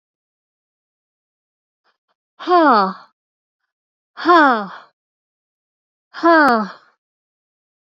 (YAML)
exhalation_length: 7.9 s
exhalation_amplitude: 29350
exhalation_signal_mean_std_ratio: 0.32
survey_phase: beta (2021-08-13 to 2022-03-07)
age: 45-64
gender: Female
wearing_mask: 'No'
symptom_sore_throat: true
symptom_fatigue: true
symptom_headache: true
smoker_status: Never smoked
respiratory_condition_asthma: true
respiratory_condition_other: true
recruitment_source: REACT
submission_delay: 2 days
covid_test_result: Negative
covid_test_method: RT-qPCR